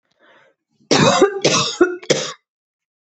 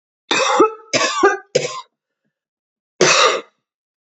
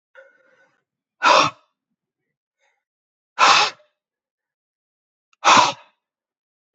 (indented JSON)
{
  "three_cough_length": "3.2 s",
  "three_cough_amplitude": 28614,
  "three_cough_signal_mean_std_ratio": 0.46,
  "cough_length": "4.2 s",
  "cough_amplitude": 29438,
  "cough_signal_mean_std_ratio": 0.47,
  "exhalation_length": "6.7 s",
  "exhalation_amplitude": 30798,
  "exhalation_signal_mean_std_ratio": 0.28,
  "survey_phase": "beta (2021-08-13 to 2022-03-07)",
  "age": "45-64",
  "gender": "Female",
  "wearing_mask": "No",
  "symptom_cough_any": true,
  "symptom_runny_or_blocked_nose": true,
  "symptom_shortness_of_breath": true,
  "symptom_sore_throat": true,
  "symptom_fatigue": true,
  "symptom_headache": true,
  "symptom_other": true,
  "smoker_status": "Ex-smoker",
  "respiratory_condition_asthma": false,
  "respiratory_condition_other": false,
  "recruitment_source": "Test and Trace",
  "submission_delay": "1 day",
  "covid_test_result": "Positive",
  "covid_test_method": "RT-qPCR"
}